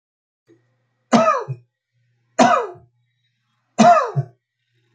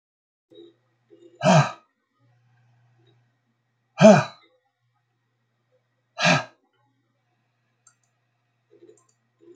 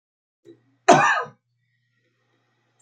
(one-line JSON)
{"three_cough_length": "4.9 s", "three_cough_amplitude": 27744, "three_cough_signal_mean_std_ratio": 0.35, "exhalation_length": "9.6 s", "exhalation_amplitude": 28360, "exhalation_signal_mean_std_ratio": 0.21, "cough_length": "2.8 s", "cough_amplitude": 29270, "cough_signal_mean_std_ratio": 0.26, "survey_phase": "beta (2021-08-13 to 2022-03-07)", "age": "65+", "gender": "Male", "wearing_mask": "No", "symptom_runny_or_blocked_nose": true, "symptom_onset": "5 days", "smoker_status": "Never smoked", "respiratory_condition_asthma": false, "respiratory_condition_other": false, "recruitment_source": "REACT", "submission_delay": "3 days", "covid_test_result": "Negative", "covid_test_method": "RT-qPCR", "influenza_a_test_result": "Negative", "influenza_b_test_result": "Negative"}